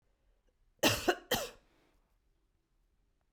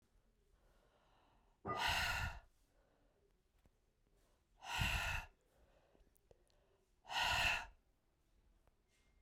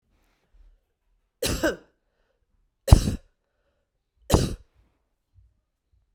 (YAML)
cough_length: 3.3 s
cough_amplitude: 6869
cough_signal_mean_std_ratio: 0.27
exhalation_length: 9.2 s
exhalation_amplitude: 1748
exhalation_signal_mean_std_ratio: 0.39
three_cough_length: 6.1 s
three_cough_amplitude: 32768
three_cough_signal_mean_std_ratio: 0.21
survey_phase: beta (2021-08-13 to 2022-03-07)
age: 45-64
gender: Female
wearing_mask: 'No'
symptom_runny_or_blocked_nose: true
smoker_status: Current smoker (1 to 10 cigarettes per day)
respiratory_condition_asthma: false
respiratory_condition_other: false
recruitment_source: REACT
submission_delay: 3 days
covid_test_result: Negative
covid_test_method: RT-qPCR
influenza_a_test_result: Unknown/Void
influenza_b_test_result: Unknown/Void